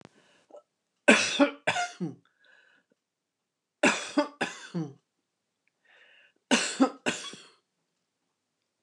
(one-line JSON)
{"cough_length": "8.8 s", "cough_amplitude": 22380, "cough_signal_mean_std_ratio": 0.31, "survey_phase": "beta (2021-08-13 to 2022-03-07)", "age": "65+", "gender": "Female", "wearing_mask": "No", "symptom_none": true, "smoker_status": "Ex-smoker", "respiratory_condition_asthma": false, "respiratory_condition_other": false, "recruitment_source": "REACT", "submission_delay": "1 day", "covid_test_result": "Negative", "covid_test_method": "RT-qPCR", "influenza_a_test_result": "Negative", "influenza_b_test_result": "Negative"}